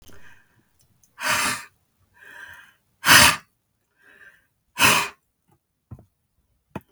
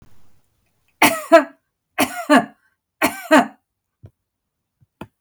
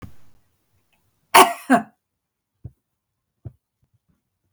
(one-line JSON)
{"exhalation_length": "6.9 s", "exhalation_amplitude": 32768, "exhalation_signal_mean_std_ratio": 0.28, "three_cough_length": "5.2 s", "three_cough_amplitude": 32768, "three_cough_signal_mean_std_ratio": 0.3, "cough_length": "4.5 s", "cough_amplitude": 32768, "cough_signal_mean_std_ratio": 0.2, "survey_phase": "beta (2021-08-13 to 2022-03-07)", "age": "45-64", "gender": "Female", "wearing_mask": "No", "symptom_none": true, "symptom_onset": "4 days", "smoker_status": "Ex-smoker", "respiratory_condition_asthma": false, "respiratory_condition_other": false, "recruitment_source": "REACT", "submission_delay": "1 day", "covid_test_result": "Negative", "covid_test_method": "RT-qPCR"}